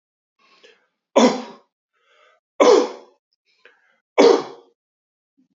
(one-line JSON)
{"three_cough_length": "5.5 s", "three_cough_amplitude": 26904, "three_cough_signal_mean_std_ratio": 0.29, "survey_phase": "alpha (2021-03-01 to 2021-08-12)", "age": "45-64", "gender": "Male", "wearing_mask": "No", "symptom_none": true, "smoker_status": "Never smoked", "respiratory_condition_asthma": false, "respiratory_condition_other": false, "recruitment_source": "Test and Trace", "submission_delay": "2 days", "covid_test_result": "Positive", "covid_test_method": "RT-qPCR", "covid_ct_value": 27.2, "covid_ct_gene": "N gene"}